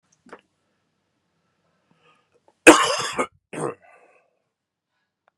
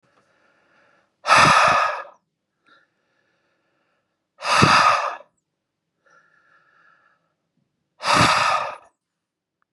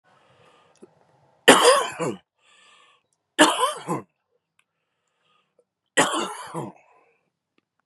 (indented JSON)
{
  "cough_length": "5.4 s",
  "cough_amplitude": 32768,
  "cough_signal_mean_std_ratio": 0.2,
  "exhalation_length": "9.7 s",
  "exhalation_amplitude": 31973,
  "exhalation_signal_mean_std_ratio": 0.37,
  "three_cough_length": "7.9 s",
  "three_cough_amplitude": 32768,
  "three_cough_signal_mean_std_ratio": 0.3,
  "survey_phase": "beta (2021-08-13 to 2022-03-07)",
  "age": "18-44",
  "gender": "Male",
  "wearing_mask": "No",
  "symptom_cough_any": true,
  "symptom_runny_or_blocked_nose": true,
  "symptom_shortness_of_breath": true,
  "symptom_change_to_sense_of_smell_or_taste": true,
  "symptom_other": true,
  "symptom_onset": "2 days",
  "smoker_status": "Ex-smoker",
  "respiratory_condition_asthma": true,
  "respiratory_condition_other": false,
  "recruitment_source": "Test and Trace",
  "submission_delay": "1 day",
  "covid_test_result": "Positive",
  "covid_test_method": "RT-qPCR",
  "covid_ct_value": 28.6,
  "covid_ct_gene": "ORF1ab gene"
}